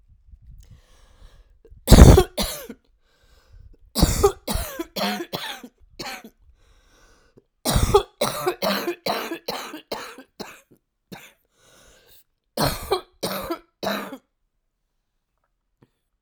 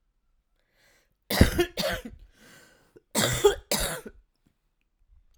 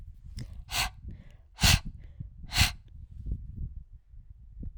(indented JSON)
{
  "three_cough_length": "16.2 s",
  "three_cough_amplitude": 32768,
  "three_cough_signal_mean_std_ratio": 0.29,
  "cough_length": "5.4 s",
  "cough_amplitude": 29830,
  "cough_signal_mean_std_ratio": 0.34,
  "exhalation_length": "4.8 s",
  "exhalation_amplitude": 12190,
  "exhalation_signal_mean_std_ratio": 0.44,
  "survey_phase": "alpha (2021-03-01 to 2021-08-12)",
  "age": "45-64",
  "gender": "Female",
  "wearing_mask": "No",
  "symptom_cough_any": true,
  "symptom_fatigue": true,
  "symptom_headache": true,
  "symptom_onset": "3 days",
  "smoker_status": "Ex-smoker",
  "respiratory_condition_asthma": false,
  "respiratory_condition_other": false,
  "recruitment_source": "Test and Trace",
  "submission_delay": "2 days",
  "covid_test_result": "Positive",
  "covid_test_method": "RT-qPCR",
  "covid_ct_value": 29.9,
  "covid_ct_gene": "ORF1ab gene"
}